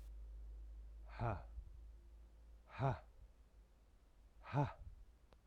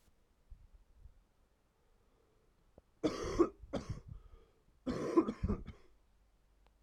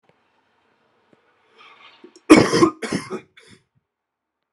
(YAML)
exhalation_length: 5.5 s
exhalation_amplitude: 1596
exhalation_signal_mean_std_ratio: 0.53
three_cough_length: 6.8 s
three_cough_amplitude: 5112
three_cough_signal_mean_std_ratio: 0.33
cough_length: 4.5 s
cough_amplitude: 32768
cough_signal_mean_std_ratio: 0.24
survey_phase: alpha (2021-03-01 to 2021-08-12)
age: 18-44
gender: Male
wearing_mask: 'No'
symptom_cough_any: true
symptom_shortness_of_breath: true
symptom_headache: true
symptom_onset: 3 days
smoker_status: Never smoked
respiratory_condition_asthma: false
respiratory_condition_other: false
recruitment_source: Test and Trace
submission_delay: 2 days
covid_test_result: Positive
covid_test_method: RT-qPCR
covid_ct_value: 20.5
covid_ct_gene: ORF1ab gene
covid_ct_mean: 21.0
covid_viral_load: 130000 copies/ml
covid_viral_load_category: Low viral load (10K-1M copies/ml)